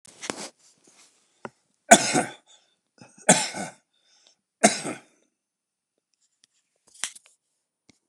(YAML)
three_cough_length: 8.1 s
three_cough_amplitude: 29204
three_cough_signal_mean_std_ratio: 0.21
survey_phase: beta (2021-08-13 to 2022-03-07)
age: 65+
gender: Male
wearing_mask: 'No'
symptom_none: true
smoker_status: Ex-smoker
respiratory_condition_asthma: false
respiratory_condition_other: false
recruitment_source: REACT
submission_delay: 4 days
covid_test_result: Negative
covid_test_method: RT-qPCR
influenza_a_test_result: Negative
influenza_b_test_result: Negative